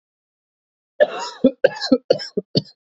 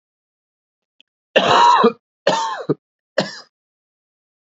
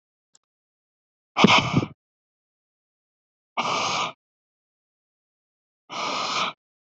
cough_length: 2.9 s
cough_amplitude: 28118
cough_signal_mean_std_ratio: 0.32
three_cough_length: 4.4 s
three_cough_amplitude: 28312
three_cough_signal_mean_std_ratio: 0.38
exhalation_length: 6.9 s
exhalation_amplitude: 27295
exhalation_signal_mean_std_ratio: 0.33
survey_phase: beta (2021-08-13 to 2022-03-07)
age: 18-44
gender: Male
wearing_mask: 'No'
symptom_cough_any: true
symptom_runny_or_blocked_nose: true
symptom_shortness_of_breath: true
symptom_sore_throat: true
symptom_fatigue: true
symptom_fever_high_temperature: true
symptom_headache: true
symptom_onset: 4 days
smoker_status: Never smoked
respiratory_condition_asthma: false
respiratory_condition_other: false
recruitment_source: Test and Trace
submission_delay: 3 days
covid_test_result: Positive
covid_test_method: RT-qPCR
covid_ct_value: 22.9
covid_ct_gene: N gene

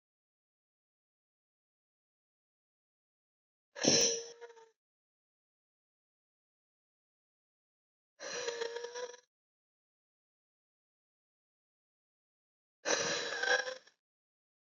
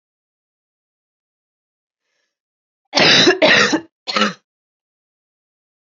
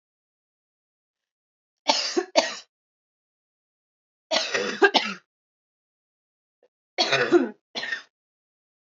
exhalation_length: 14.7 s
exhalation_amplitude: 7490
exhalation_signal_mean_std_ratio: 0.26
cough_length: 5.8 s
cough_amplitude: 31071
cough_signal_mean_std_ratio: 0.33
three_cough_length: 9.0 s
three_cough_amplitude: 23256
three_cough_signal_mean_std_ratio: 0.32
survey_phase: beta (2021-08-13 to 2022-03-07)
age: 18-44
gender: Female
wearing_mask: 'No'
symptom_cough_any: true
symptom_new_continuous_cough: true
symptom_runny_or_blocked_nose: true
symptom_shortness_of_breath: true
symptom_sore_throat: true
symptom_fatigue: true
symptom_fever_high_temperature: true
symptom_headache: true
symptom_change_to_sense_of_smell_or_taste: true
symptom_loss_of_taste: true
symptom_other: true
symptom_onset: 4 days
smoker_status: Never smoked
respiratory_condition_asthma: true
respiratory_condition_other: false
recruitment_source: Test and Trace
submission_delay: 1 day
covid_test_result: Positive
covid_test_method: RT-qPCR
covid_ct_value: 15.0
covid_ct_gene: N gene
covid_ct_mean: 15.2
covid_viral_load: 11000000 copies/ml
covid_viral_load_category: High viral load (>1M copies/ml)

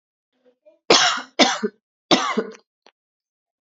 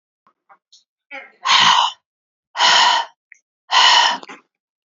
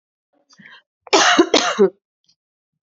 three_cough_length: 3.7 s
three_cough_amplitude: 32462
three_cough_signal_mean_std_ratio: 0.35
exhalation_length: 4.9 s
exhalation_amplitude: 32768
exhalation_signal_mean_std_ratio: 0.46
cough_length: 2.9 s
cough_amplitude: 31122
cough_signal_mean_std_ratio: 0.38
survey_phase: beta (2021-08-13 to 2022-03-07)
age: 18-44
gender: Female
wearing_mask: 'No'
symptom_cough_any: true
symptom_runny_or_blocked_nose: true
symptom_headache: true
symptom_loss_of_taste: true
symptom_onset: 5 days
smoker_status: Ex-smoker
respiratory_condition_asthma: false
respiratory_condition_other: false
recruitment_source: Test and Trace
submission_delay: 2 days
covid_test_result: Positive
covid_test_method: ePCR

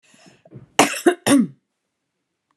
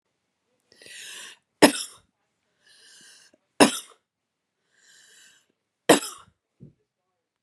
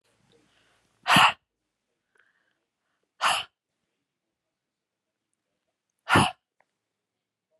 cough_length: 2.6 s
cough_amplitude: 32768
cough_signal_mean_std_ratio: 0.33
three_cough_length: 7.4 s
three_cough_amplitude: 32623
three_cough_signal_mean_std_ratio: 0.18
exhalation_length: 7.6 s
exhalation_amplitude: 17705
exhalation_signal_mean_std_ratio: 0.22
survey_phase: beta (2021-08-13 to 2022-03-07)
age: 45-64
gender: Female
wearing_mask: 'No'
symptom_none: true
smoker_status: Ex-smoker
respiratory_condition_asthma: false
respiratory_condition_other: false
recruitment_source: REACT
submission_delay: 3 days
covid_test_result: Negative
covid_test_method: RT-qPCR
influenza_a_test_result: Negative
influenza_b_test_result: Negative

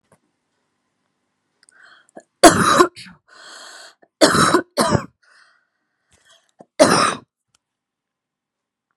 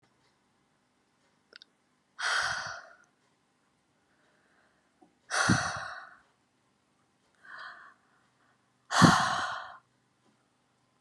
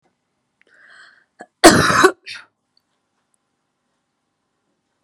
three_cough_length: 9.0 s
three_cough_amplitude: 32768
three_cough_signal_mean_std_ratio: 0.3
exhalation_length: 11.0 s
exhalation_amplitude: 17735
exhalation_signal_mean_std_ratio: 0.29
cough_length: 5.0 s
cough_amplitude: 32768
cough_signal_mean_std_ratio: 0.23
survey_phase: beta (2021-08-13 to 2022-03-07)
age: 18-44
gender: Female
wearing_mask: 'No'
symptom_sore_throat: true
smoker_status: Current smoker (e-cigarettes or vapes only)
respiratory_condition_asthma: false
respiratory_condition_other: false
recruitment_source: Test and Trace
submission_delay: 1 day
covid_test_result: Positive
covid_test_method: RT-qPCR
covid_ct_value: 20.4
covid_ct_gene: N gene
covid_ct_mean: 22.4
covid_viral_load: 45000 copies/ml
covid_viral_load_category: Low viral load (10K-1M copies/ml)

